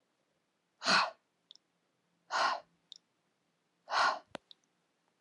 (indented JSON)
{
  "exhalation_length": "5.2 s",
  "exhalation_amplitude": 6206,
  "exhalation_signal_mean_std_ratio": 0.31,
  "survey_phase": "alpha (2021-03-01 to 2021-08-12)",
  "age": "18-44",
  "gender": "Female",
  "wearing_mask": "No",
  "symptom_none": true,
  "smoker_status": "Never smoked",
  "respiratory_condition_asthma": false,
  "respiratory_condition_other": false,
  "recruitment_source": "REACT",
  "submission_delay": "2 days",
  "covid_test_result": "Negative",
  "covid_test_method": "RT-qPCR",
  "covid_ct_value": 39.0,
  "covid_ct_gene": "N gene"
}